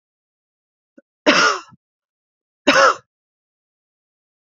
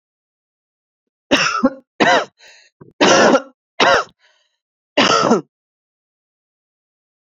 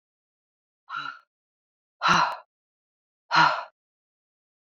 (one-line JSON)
{"cough_length": "4.5 s", "cough_amplitude": 29352, "cough_signal_mean_std_ratio": 0.28, "three_cough_length": "7.3 s", "three_cough_amplitude": 32675, "three_cough_signal_mean_std_ratio": 0.39, "exhalation_length": "4.6 s", "exhalation_amplitude": 16814, "exhalation_signal_mean_std_ratio": 0.3, "survey_phase": "beta (2021-08-13 to 2022-03-07)", "age": "18-44", "gender": "Female", "wearing_mask": "No", "symptom_sore_throat": true, "smoker_status": "Ex-smoker", "respiratory_condition_asthma": false, "respiratory_condition_other": false, "recruitment_source": "Test and Trace", "submission_delay": "2 days", "covid_test_result": "Positive", "covid_test_method": "ePCR"}